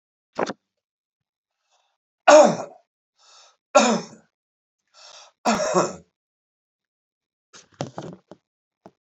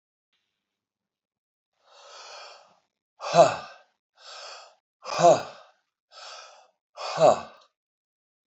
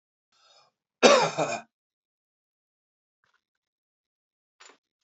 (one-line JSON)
{"three_cough_length": "9.0 s", "three_cough_amplitude": 28451, "three_cough_signal_mean_std_ratio": 0.25, "exhalation_length": "8.5 s", "exhalation_amplitude": 19873, "exhalation_signal_mean_std_ratio": 0.25, "cough_length": "5.0 s", "cough_amplitude": 23113, "cough_signal_mean_std_ratio": 0.21, "survey_phase": "beta (2021-08-13 to 2022-03-07)", "age": "65+", "gender": "Male", "wearing_mask": "No", "symptom_new_continuous_cough": true, "symptom_sore_throat": true, "smoker_status": "Never smoked", "respiratory_condition_asthma": false, "respiratory_condition_other": false, "recruitment_source": "Test and Trace", "submission_delay": "1 day", "covid_test_result": "Positive", "covid_test_method": "RT-qPCR", "covid_ct_value": 14.5, "covid_ct_gene": "ORF1ab gene", "covid_ct_mean": 14.8, "covid_viral_load": "14000000 copies/ml", "covid_viral_load_category": "High viral load (>1M copies/ml)"}